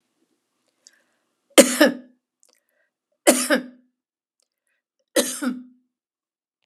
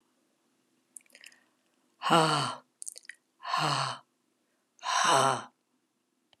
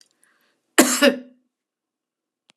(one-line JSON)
{"three_cough_length": "6.7 s", "three_cough_amplitude": 32768, "three_cough_signal_mean_std_ratio": 0.25, "exhalation_length": "6.4 s", "exhalation_amplitude": 13217, "exhalation_signal_mean_std_ratio": 0.38, "cough_length": "2.6 s", "cough_amplitude": 32767, "cough_signal_mean_std_ratio": 0.27, "survey_phase": "beta (2021-08-13 to 2022-03-07)", "age": "65+", "gender": "Female", "wearing_mask": "No", "symptom_none": true, "smoker_status": "Ex-smoker", "respiratory_condition_asthma": false, "respiratory_condition_other": false, "recruitment_source": "REACT", "submission_delay": "2 days", "covid_test_result": "Negative", "covid_test_method": "RT-qPCR"}